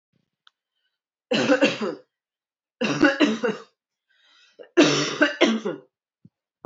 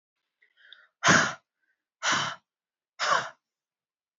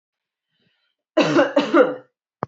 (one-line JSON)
{"three_cough_length": "6.7 s", "three_cough_amplitude": 23842, "three_cough_signal_mean_std_ratio": 0.43, "exhalation_length": "4.2 s", "exhalation_amplitude": 15364, "exhalation_signal_mean_std_ratio": 0.34, "cough_length": "2.5 s", "cough_amplitude": 24457, "cough_signal_mean_std_ratio": 0.41, "survey_phase": "beta (2021-08-13 to 2022-03-07)", "age": "45-64", "gender": "Female", "wearing_mask": "No", "symptom_none": true, "smoker_status": "Never smoked", "respiratory_condition_asthma": false, "respiratory_condition_other": false, "recruitment_source": "REACT", "submission_delay": "2 days", "covid_test_result": "Negative", "covid_test_method": "RT-qPCR"}